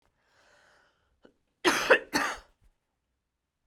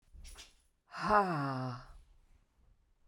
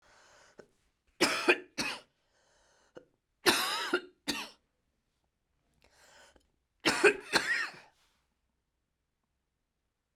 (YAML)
cough_length: 3.7 s
cough_amplitude: 16828
cough_signal_mean_std_ratio: 0.27
exhalation_length: 3.1 s
exhalation_amplitude: 6220
exhalation_signal_mean_std_ratio: 0.42
three_cough_length: 10.2 s
three_cough_amplitude: 12355
three_cough_signal_mean_std_ratio: 0.31
survey_phase: beta (2021-08-13 to 2022-03-07)
age: 45-64
gender: Female
wearing_mask: 'No'
symptom_cough_any: true
symptom_new_continuous_cough: true
symptom_runny_or_blocked_nose: true
symptom_fatigue: true
symptom_headache: true
smoker_status: Never smoked
respiratory_condition_asthma: false
respiratory_condition_other: false
recruitment_source: Test and Trace
submission_delay: 2 days
covid_test_result: Positive
covid_test_method: RT-qPCR
covid_ct_value: 27.2
covid_ct_gene: ORF1ab gene
covid_ct_mean: 28.0
covid_viral_load: 660 copies/ml
covid_viral_load_category: Minimal viral load (< 10K copies/ml)